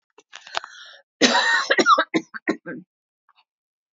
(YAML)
cough_length: 3.9 s
cough_amplitude: 28672
cough_signal_mean_std_ratio: 0.4
survey_phase: alpha (2021-03-01 to 2021-08-12)
age: 45-64
gender: Female
wearing_mask: 'No'
symptom_fatigue: true
smoker_status: Never smoked
recruitment_source: REACT
submission_delay: 3 days
covid_test_result: Negative
covid_test_method: RT-qPCR